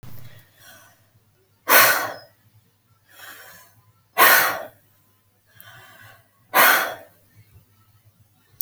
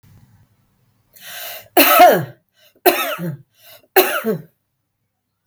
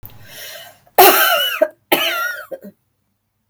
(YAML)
exhalation_length: 8.6 s
exhalation_amplitude: 32768
exhalation_signal_mean_std_ratio: 0.31
three_cough_length: 5.5 s
three_cough_amplitude: 32768
three_cough_signal_mean_std_ratio: 0.37
cough_length: 3.5 s
cough_amplitude: 32768
cough_signal_mean_std_ratio: 0.45
survey_phase: alpha (2021-03-01 to 2021-08-12)
age: 45-64
gender: Female
wearing_mask: 'No'
symptom_none: true
smoker_status: Ex-smoker
respiratory_condition_asthma: false
respiratory_condition_other: false
recruitment_source: REACT
submission_delay: 7 days
covid_test_result: Negative
covid_test_method: RT-qPCR